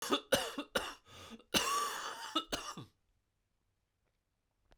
{"cough_length": "4.8 s", "cough_amplitude": 5550, "cough_signal_mean_std_ratio": 0.44, "survey_phase": "beta (2021-08-13 to 2022-03-07)", "age": "45-64", "gender": "Male", "wearing_mask": "No", "symptom_cough_any": true, "symptom_runny_or_blocked_nose": true, "symptom_shortness_of_breath": true, "symptom_diarrhoea": true, "symptom_fatigue": true, "symptom_headache": true, "symptom_onset": "4 days", "smoker_status": "Ex-smoker", "respiratory_condition_asthma": false, "respiratory_condition_other": false, "recruitment_source": "Test and Trace", "submission_delay": "2 days", "covid_test_result": "Positive", "covid_test_method": "RT-qPCR", "covid_ct_value": 24.1, "covid_ct_gene": "ORF1ab gene"}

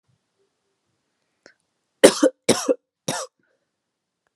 {"three_cough_length": "4.4 s", "three_cough_amplitude": 32768, "three_cough_signal_mean_std_ratio": 0.22, "survey_phase": "alpha (2021-03-01 to 2021-08-12)", "age": "18-44", "gender": "Female", "wearing_mask": "No", "symptom_cough_any": true, "symptom_fatigue": true, "symptom_change_to_sense_of_smell_or_taste": true, "symptom_loss_of_taste": true, "symptom_onset": "3 days", "smoker_status": "Never smoked", "respiratory_condition_asthma": false, "respiratory_condition_other": false, "recruitment_source": "Test and Trace", "submission_delay": "2 days", "covid_test_result": "Positive", "covid_test_method": "RT-qPCR", "covid_ct_value": 19.6, "covid_ct_gene": "S gene", "covid_ct_mean": 20.9, "covid_viral_load": "140000 copies/ml", "covid_viral_load_category": "Low viral load (10K-1M copies/ml)"}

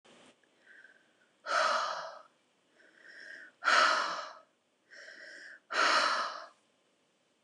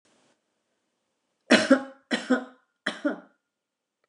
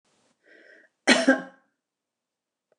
{"exhalation_length": "7.4 s", "exhalation_amplitude": 7031, "exhalation_signal_mean_std_ratio": 0.43, "three_cough_length": "4.1 s", "three_cough_amplitude": 21203, "three_cough_signal_mean_std_ratio": 0.28, "cough_length": "2.8 s", "cough_amplitude": 21760, "cough_signal_mean_std_ratio": 0.25, "survey_phase": "beta (2021-08-13 to 2022-03-07)", "age": "65+", "gender": "Female", "wearing_mask": "No", "symptom_none": true, "smoker_status": "Ex-smoker", "respiratory_condition_asthma": true, "respiratory_condition_other": false, "recruitment_source": "REACT", "submission_delay": "2 days", "covid_test_result": "Negative", "covid_test_method": "RT-qPCR"}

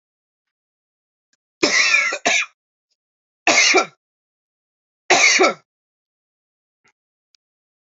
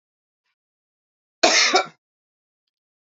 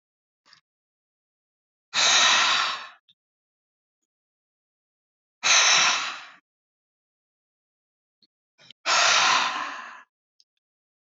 {"three_cough_length": "7.9 s", "three_cough_amplitude": 29209, "three_cough_signal_mean_std_ratio": 0.35, "cough_length": "3.2 s", "cough_amplitude": 32333, "cough_signal_mean_std_ratio": 0.28, "exhalation_length": "11.1 s", "exhalation_amplitude": 18828, "exhalation_signal_mean_std_ratio": 0.38, "survey_phase": "alpha (2021-03-01 to 2021-08-12)", "age": "18-44", "gender": "Male", "wearing_mask": "No", "symptom_cough_any": true, "symptom_shortness_of_breath": true, "symptom_diarrhoea": true, "symptom_fatigue": true, "symptom_fever_high_temperature": true, "symptom_headache": true, "symptom_change_to_sense_of_smell_or_taste": true, "symptom_loss_of_taste": true, "symptom_onset": "2 days", "smoker_status": "Never smoked", "respiratory_condition_asthma": false, "respiratory_condition_other": false, "recruitment_source": "Test and Trace", "submission_delay": "1 day", "covid_test_result": "Positive", "covid_test_method": "RT-qPCR", "covid_ct_value": 25.2, "covid_ct_gene": "N gene"}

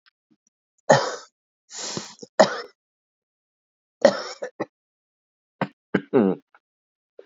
{"exhalation_length": "7.3 s", "exhalation_amplitude": 32450, "exhalation_signal_mean_std_ratio": 0.27, "survey_phase": "beta (2021-08-13 to 2022-03-07)", "age": "45-64", "gender": "Female", "wearing_mask": "No", "symptom_runny_or_blocked_nose": true, "smoker_status": "Ex-smoker", "respiratory_condition_asthma": false, "respiratory_condition_other": false, "recruitment_source": "Test and Trace", "submission_delay": "3 days", "covid_test_result": "Positive", "covid_test_method": "ePCR"}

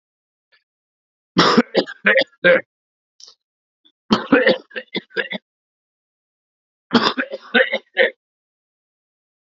{"three_cough_length": "9.5 s", "three_cough_amplitude": 32767, "three_cough_signal_mean_std_ratio": 0.34, "survey_phase": "alpha (2021-03-01 to 2021-08-12)", "age": "18-44", "gender": "Male", "wearing_mask": "No", "symptom_cough_any": true, "symptom_new_continuous_cough": true, "symptom_shortness_of_breath": true, "symptom_abdominal_pain": true, "symptom_diarrhoea": true, "symptom_fatigue": true, "symptom_fever_high_temperature": true, "symptom_headache": true, "symptom_change_to_sense_of_smell_or_taste": true, "symptom_loss_of_taste": true, "smoker_status": "Current smoker (11 or more cigarettes per day)", "respiratory_condition_asthma": false, "respiratory_condition_other": false, "recruitment_source": "Test and Trace", "submission_delay": "1 day", "covid_test_result": "Positive", "covid_test_method": "RT-qPCR", "covid_ct_value": 20.6, "covid_ct_gene": "ORF1ab gene", "covid_ct_mean": 21.3, "covid_viral_load": "100000 copies/ml", "covid_viral_load_category": "Low viral load (10K-1M copies/ml)"}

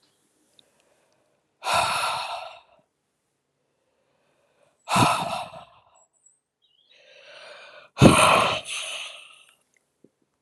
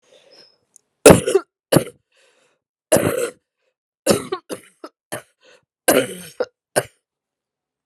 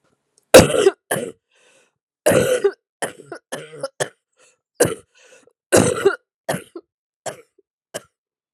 {"exhalation_length": "10.4 s", "exhalation_amplitude": 32768, "exhalation_signal_mean_std_ratio": 0.32, "three_cough_length": "7.9 s", "three_cough_amplitude": 32768, "three_cough_signal_mean_std_ratio": 0.27, "cough_length": "8.5 s", "cough_amplitude": 32768, "cough_signal_mean_std_ratio": 0.31, "survey_phase": "alpha (2021-03-01 to 2021-08-12)", "age": "45-64", "gender": "Female", "wearing_mask": "No", "symptom_cough_any": true, "symptom_diarrhoea": true, "symptom_fatigue": true, "symptom_loss_of_taste": true, "symptom_onset": "4 days", "smoker_status": "Never smoked", "respiratory_condition_asthma": false, "respiratory_condition_other": false, "recruitment_source": "Test and Trace", "submission_delay": "1 day", "covid_test_result": "Positive", "covid_test_method": "RT-qPCR", "covid_ct_value": 16.8, "covid_ct_gene": "ORF1ab gene", "covid_ct_mean": 17.3, "covid_viral_load": "2100000 copies/ml", "covid_viral_load_category": "High viral load (>1M copies/ml)"}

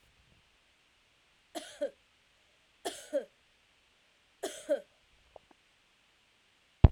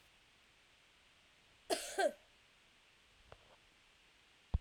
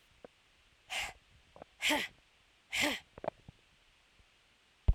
{"three_cough_length": "6.9 s", "three_cough_amplitude": 22282, "three_cough_signal_mean_std_ratio": 0.15, "cough_length": "4.6 s", "cough_amplitude": 2762, "cough_signal_mean_std_ratio": 0.26, "exhalation_length": "4.9 s", "exhalation_amplitude": 6683, "exhalation_signal_mean_std_ratio": 0.31, "survey_phase": "alpha (2021-03-01 to 2021-08-12)", "age": "45-64", "gender": "Female", "wearing_mask": "No", "symptom_cough_any": true, "symptom_shortness_of_breath": true, "symptom_fatigue": true, "symptom_headache": true, "symptom_onset": "4 days", "smoker_status": "Ex-smoker", "respiratory_condition_asthma": false, "respiratory_condition_other": false, "recruitment_source": "Test and Trace", "submission_delay": "2 days", "covid_test_result": "Positive", "covid_test_method": "RT-qPCR", "covid_ct_value": 27.8, "covid_ct_gene": "ORF1ab gene", "covid_ct_mean": 28.5, "covid_viral_load": "460 copies/ml", "covid_viral_load_category": "Minimal viral load (< 10K copies/ml)"}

